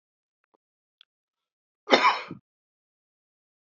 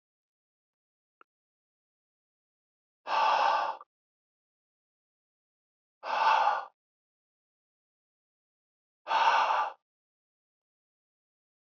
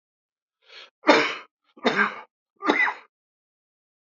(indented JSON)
{
  "cough_length": "3.7 s",
  "cough_amplitude": 24634,
  "cough_signal_mean_std_ratio": 0.2,
  "exhalation_length": "11.6 s",
  "exhalation_amplitude": 7953,
  "exhalation_signal_mean_std_ratio": 0.32,
  "three_cough_length": "4.2 s",
  "three_cough_amplitude": 26983,
  "three_cough_signal_mean_std_ratio": 0.34,
  "survey_phase": "beta (2021-08-13 to 2022-03-07)",
  "age": "45-64",
  "gender": "Male",
  "wearing_mask": "No",
  "symptom_none": true,
  "symptom_onset": "12 days",
  "smoker_status": "Never smoked",
  "respiratory_condition_asthma": false,
  "respiratory_condition_other": false,
  "recruitment_source": "REACT",
  "submission_delay": "1 day",
  "covid_test_result": "Negative",
  "covid_test_method": "RT-qPCR"
}